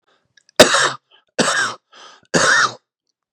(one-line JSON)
{"three_cough_length": "3.3 s", "three_cough_amplitude": 32768, "three_cough_signal_mean_std_ratio": 0.42, "survey_phase": "beta (2021-08-13 to 2022-03-07)", "age": "18-44", "gender": "Male", "wearing_mask": "No", "symptom_cough_any": true, "symptom_runny_or_blocked_nose": true, "symptom_shortness_of_breath": true, "symptom_sore_throat": true, "symptom_abdominal_pain": true, "symptom_fatigue": true, "symptom_headache": true, "symptom_change_to_sense_of_smell_or_taste": true, "symptom_loss_of_taste": true, "symptom_onset": "4 days", "smoker_status": "Current smoker (11 or more cigarettes per day)", "respiratory_condition_asthma": true, "respiratory_condition_other": false, "recruitment_source": "Test and Trace", "submission_delay": "2 days", "covid_test_result": "Positive", "covid_test_method": "ePCR"}